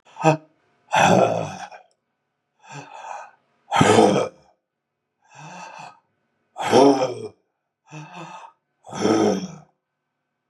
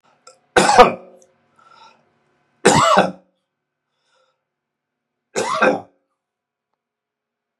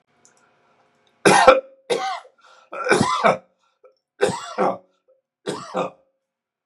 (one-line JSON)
{"exhalation_length": "10.5 s", "exhalation_amplitude": 30256, "exhalation_signal_mean_std_ratio": 0.39, "three_cough_length": "7.6 s", "three_cough_amplitude": 32768, "three_cough_signal_mean_std_ratio": 0.3, "cough_length": "6.7 s", "cough_amplitude": 32768, "cough_signal_mean_std_ratio": 0.37, "survey_phase": "beta (2021-08-13 to 2022-03-07)", "age": "65+", "gender": "Male", "wearing_mask": "No", "symptom_cough_any": true, "symptom_fatigue": true, "smoker_status": "Ex-smoker", "respiratory_condition_asthma": false, "respiratory_condition_other": false, "recruitment_source": "REACT", "submission_delay": "1 day", "covid_test_result": "Negative", "covid_test_method": "RT-qPCR", "influenza_a_test_result": "Negative", "influenza_b_test_result": "Negative"}